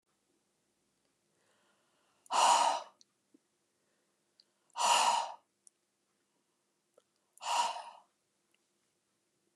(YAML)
exhalation_length: 9.6 s
exhalation_amplitude: 6790
exhalation_signal_mean_std_ratio: 0.3
survey_phase: beta (2021-08-13 to 2022-03-07)
age: 45-64
gender: Female
wearing_mask: 'No'
symptom_cough_any: true
symptom_onset: 8 days
smoker_status: Never smoked
respiratory_condition_asthma: false
respiratory_condition_other: false
recruitment_source: REACT
submission_delay: 2 days
covid_test_result: Negative
covid_test_method: RT-qPCR
influenza_a_test_result: Negative
influenza_b_test_result: Negative